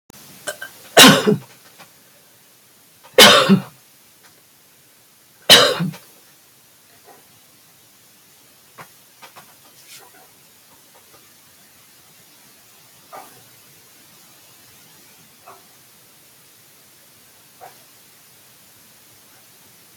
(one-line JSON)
{"three_cough_length": "20.0 s", "three_cough_amplitude": 32768, "three_cough_signal_mean_std_ratio": 0.22, "survey_phase": "alpha (2021-03-01 to 2021-08-12)", "age": "65+", "gender": "Female", "wearing_mask": "No", "symptom_none": true, "smoker_status": "Ex-smoker", "respiratory_condition_asthma": false, "respiratory_condition_other": false, "recruitment_source": "REACT", "submission_delay": "4 days", "covid_test_result": "Negative", "covid_test_method": "RT-qPCR"}